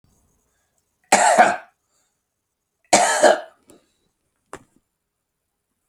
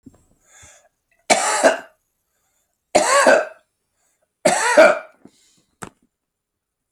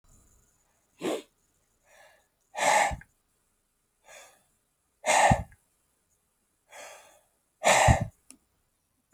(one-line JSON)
{"cough_length": "5.9 s", "cough_amplitude": 32339, "cough_signal_mean_std_ratio": 0.3, "three_cough_length": "6.9 s", "three_cough_amplitude": 32768, "three_cough_signal_mean_std_ratio": 0.36, "exhalation_length": "9.1 s", "exhalation_amplitude": 15359, "exhalation_signal_mean_std_ratio": 0.3, "survey_phase": "alpha (2021-03-01 to 2021-08-12)", "age": "65+", "gender": "Male", "wearing_mask": "No", "symptom_none": true, "smoker_status": "Never smoked", "respiratory_condition_asthma": false, "respiratory_condition_other": false, "recruitment_source": "REACT", "submission_delay": "2 days", "covid_test_result": "Negative", "covid_test_method": "RT-qPCR"}